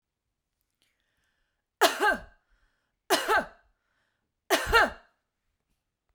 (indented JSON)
{
  "three_cough_length": "6.1 s",
  "three_cough_amplitude": 15216,
  "three_cough_signal_mean_std_ratio": 0.31,
  "survey_phase": "beta (2021-08-13 to 2022-03-07)",
  "age": "45-64",
  "gender": "Female",
  "wearing_mask": "No",
  "symptom_headache": true,
  "smoker_status": "Never smoked",
  "respiratory_condition_asthma": false,
  "respiratory_condition_other": false,
  "recruitment_source": "REACT",
  "submission_delay": "1 day",
  "covid_test_result": "Negative",
  "covid_test_method": "RT-qPCR"
}